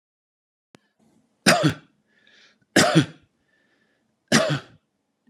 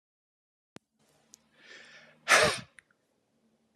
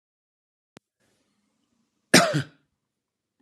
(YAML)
three_cough_length: 5.3 s
three_cough_amplitude: 27815
three_cough_signal_mean_std_ratio: 0.31
exhalation_length: 3.8 s
exhalation_amplitude: 14291
exhalation_signal_mean_std_ratio: 0.22
cough_length: 3.4 s
cough_amplitude: 30411
cough_signal_mean_std_ratio: 0.2
survey_phase: beta (2021-08-13 to 2022-03-07)
age: 45-64
gender: Male
wearing_mask: 'No'
symptom_none: true
smoker_status: Ex-smoker
respiratory_condition_asthma: false
respiratory_condition_other: false
recruitment_source: REACT
submission_delay: 1 day
covid_test_result: Negative
covid_test_method: RT-qPCR